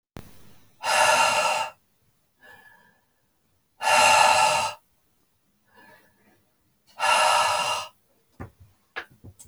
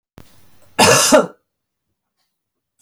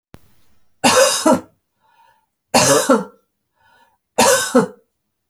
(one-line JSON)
{"exhalation_length": "9.5 s", "exhalation_amplitude": 20891, "exhalation_signal_mean_std_ratio": 0.45, "cough_length": "2.8 s", "cough_amplitude": 31749, "cough_signal_mean_std_ratio": 0.34, "three_cough_length": "5.3 s", "three_cough_amplitude": 32768, "three_cough_signal_mean_std_ratio": 0.43, "survey_phase": "beta (2021-08-13 to 2022-03-07)", "age": "45-64", "gender": "Female", "wearing_mask": "No", "symptom_runny_or_blocked_nose": true, "symptom_headache": true, "symptom_other": true, "symptom_onset": "11 days", "smoker_status": "Ex-smoker", "respiratory_condition_asthma": false, "respiratory_condition_other": false, "recruitment_source": "REACT", "submission_delay": "2 days", "covid_test_result": "Negative", "covid_test_method": "RT-qPCR"}